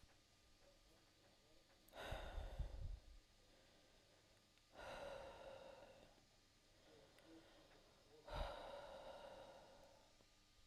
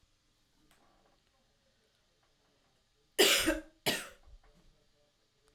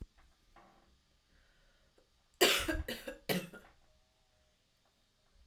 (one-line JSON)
{"exhalation_length": "10.7 s", "exhalation_amplitude": 562, "exhalation_signal_mean_std_ratio": 0.59, "cough_length": "5.5 s", "cough_amplitude": 8736, "cough_signal_mean_std_ratio": 0.25, "three_cough_length": "5.5 s", "three_cough_amplitude": 7301, "three_cough_signal_mean_std_ratio": 0.28, "survey_phase": "alpha (2021-03-01 to 2021-08-12)", "age": "18-44", "gender": "Female", "wearing_mask": "No", "symptom_cough_any": true, "symptom_fatigue": true, "symptom_change_to_sense_of_smell_or_taste": true, "symptom_loss_of_taste": true, "symptom_onset": "3 days", "smoker_status": "Never smoked", "respiratory_condition_asthma": false, "respiratory_condition_other": false, "recruitment_source": "Test and Trace", "submission_delay": "1 day", "covid_test_result": "Positive", "covid_test_method": "RT-qPCR", "covid_ct_value": 16.5, "covid_ct_gene": "S gene", "covid_ct_mean": 16.9, "covid_viral_load": "2900000 copies/ml", "covid_viral_load_category": "High viral load (>1M copies/ml)"}